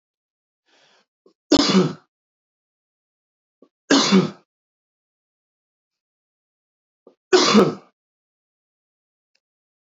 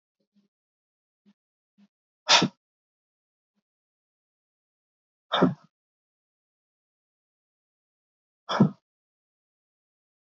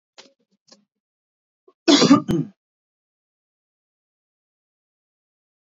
{
  "three_cough_length": "9.8 s",
  "three_cough_amplitude": 26118,
  "three_cough_signal_mean_std_ratio": 0.27,
  "exhalation_length": "10.3 s",
  "exhalation_amplitude": 20310,
  "exhalation_signal_mean_std_ratio": 0.17,
  "cough_length": "5.6 s",
  "cough_amplitude": 28103,
  "cough_signal_mean_std_ratio": 0.22,
  "survey_phase": "beta (2021-08-13 to 2022-03-07)",
  "age": "18-44",
  "gender": "Male",
  "wearing_mask": "No",
  "symptom_runny_or_blocked_nose": true,
  "smoker_status": "Ex-smoker",
  "respiratory_condition_asthma": false,
  "respiratory_condition_other": false,
  "recruitment_source": "Test and Trace",
  "submission_delay": "1 day",
  "covid_test_result": "Positive",
  "covid_test_method": "RT-qPCR",
  "covid_ct_value": 28.8,
  "covid_ct_gene": "ORF1ab gene"
}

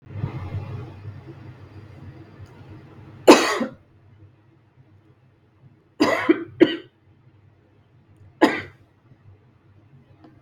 {
  "three_cough_length": "10.4 s",
  "three_cough_amplitude": 32766,
  "three_cough_signal_mean_std_ratio": 0.28,
  "survey_phase": "beta (2021-08-13 to 2022-03-07)",
  "age": "18-44",
  "gender": "Female",
  "wearing_mask": "No",
  "symptom_runny_or_blocked_nose": true,
  "smoker_status": "Never smoked",
  "respiratory_condition_asthma": false,
  "respiratory_condition_other": false,
  "recruitment_source": "REACT",
  "submission_delay": "2 days",
  "covid_test_result": "Negative",
  "covid_test_method": "RT-qPCR",
  "influenza_a_test_result": "Negative",
  "influenza_b_test_result": "Negative"
}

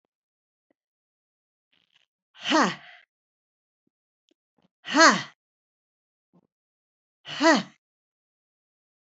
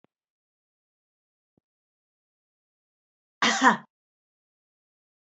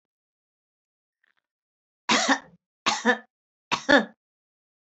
{
  "exhalation_length": "9.1 s",
  "exhalation_amplitude": 23558,
  "exhalation_signal_mean_std_ratio": 0.22,
  "cough_length": "5.2 s",
  "cough_amplitude": 20187,
  "cough_signal_mean_std_ratio": 0.18,
  "three_cough_length": "4.9 s",
  "three_cough_amplitude": 17069,
  "three_cough_signal_mean_std_ratio": 0.29,
  "survey_phase": "beta (2021-08-13 to 2022-03-07)",
  "age": "45-64",
  "gender": "Female",
  "wearing_mask": "No",
  "symptom_sore_throat": true,
  "symptom_fatigue": true,
  "symptom_headache": true,
  "symptom_other": true,
  "symptom_onset": "5 days",
  "smoker_status": "Never smoked",
  "respiratory_condition_asthma": false,
  "respiratory_condition_other": false,
  "recruitment_source": "Test and Trace",
  "submission_delay": "2 days",
  "covid_test_result": "Positive",
  "covid_test_method": "RT-qPCR"
}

